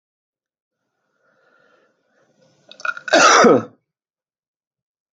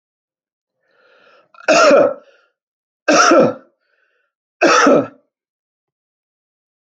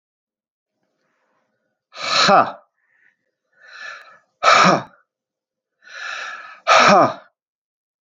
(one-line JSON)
{"cough_length": "5.1 s", "cough_amplitude": 29564, "cough_signal_mean_std_ratio": 0.27, "three_cough_length": "6.8 s", "three_cough_amplitude": 31158, "three_cough_signal_mean_std_ratio": 0.38, "exhalation_length": "8.0 s", "exhalation_amplitude": 30920, "exhalation_signal_mean_std_ratio": 0.34, "survey_phase": "beta (2021-08-13 to 2022-03-07)", "age": "45-64", "gender": "Male", "wearing_mask": "No", "symptom_cough_any": true, "symptom_runny_or_blocked_nose": true, "symptom_fatigue": true, "symptom_headache": true, "smoker_status": "Ex-smoker", "respiratory_condition_asthma": false, "respiratory_condition_other": false, "recruitment_source": "Test and Trace", "submission_delay": "1 day", "covid_test_result": "Positive", "covid_test_method": "RT-qPCR"}